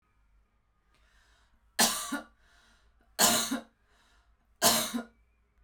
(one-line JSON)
{"three_cough_length": "5.6 s", "three_cough_amplitude": 13129, "three_cough_signal_mean_std_ratio": 0.34, "survey_phase": "beta (2021-08-13 to 2022-03-07)", "age": "18-44", "gender": "Female", "wearing_mask": "No", "symptom_fatigue": true, "symptom_headache": true, "smoker_status": "Ex-smoker", "respiratory_condition_asthma": false, "respiratory_condition_other": false, "recruitment_source": "REACT", "submission_delay": "7 days", "covid_test_result": "Negative", "covid_test_method": "RT-qPCR"}